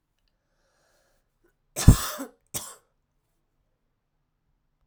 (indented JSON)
{
  "cough_length": "4.9 s",
  "cough_amplitude": 32768,
  "cough_signal_mean_std_ratio": 0.15,
  "survey_phase": "alpha (2021-03-01 to 2021-08-12)",
  "age": "18-44",
  "gender": "Female",
  "wearing_mask": "No",
  "symptom_cough_any": true,
  "symptom_fatigue": true,
  "symptom_fever_high_temperature": true,
  "symptom_change_to_sense_of_smell_or_taste": true,
  "symptom_onset": "2 days",
  "smoker_status": "Current smoker (e-cigarettes or vapes only)",
  "respiratory_condition_asthma": false,
  "respiratory_condition_other": false,
  "recruitment_source": "Test and Trace",
  "submission_delay": "2 days",
  "covid_test_result": "Positive",
  "covid_test_method": "RT-qPCR",
  "covid_ct_value": 31.3,
  "covid_ct_gene": "N gene"
}